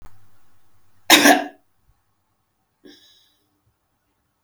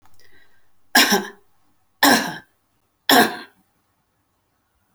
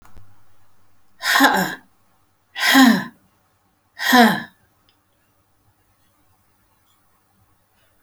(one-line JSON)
{"cough_length": "4.4 s", "cough_amplitude": 32767, "cough_signal_mean_std_ratio": 0.23, "three_cough_length": "4.9 s", "three_cough_amplitude": 32767, "three_cough_signal_mean_std_ratio": 0.32, "exhalation_length": "8.0 s", "exhalation_amplitude": 32649, "exhalation_signal_mean_std_ratio": 0.33, "survey_phase": "beta (2021-08-13 to 2022-03-07)", "age": "45-64", "gender": "Female", "wearing_mask": "No", "symptom_none": true, "smoker_status": "Never smoked", "respiratory_condition_asthma": false, "respiratory_condition_other": false, "recruitment_source": "Test and Trace", "submission_delay": "3 days", "covid_test_result": "Positive", "covid_test_method": "RT-qPCR", "covid_ct_value": 27.2, "covid_ct_gene": "ORF1ab gene", "covid_ct_mean": 27.7, "covid_viral_load": "810 copies/ml", "covid_viral_load_category": "Minimal viral load (< 10K copies/ml)"}